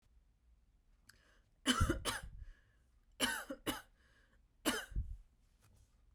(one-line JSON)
{"three_cough_length": "6.1 s", "three_cough_amplitude": 3565, "three_cough_signal_mean_std_ratio": 0.38, "survey_phase": "beta (2021-08-13 to 2022-03-07)", "age": "18-44", "gender": "Female", "wearing_mask": "No", "symptom_runny_or_blocked_nose": true, "symptom_fever_high_temperature": true, "symptom_headache": true, "symptom_change_to_sense_of_smell_or_taste": true, "symptom_other": true, "symptom_onset": "4 days", "smoker_status": "Never smoked", "respiratory_condition_asthma": false, "respiratory_condition_other": false, "recruitment_source": "Test and Trace", "submission_delay": "2 days", "covid_test_result": "Positive", "covid_test_method": "RT-qPCR", "covid_ct_value": 18.4, "covid_ct_gene": "N gene", "covid_ct_mean": 19.4, "covid_viral_load": "440000 copies/ml", "covid_viral_load_category": "Low viral load (10K-1M copies/ml)"}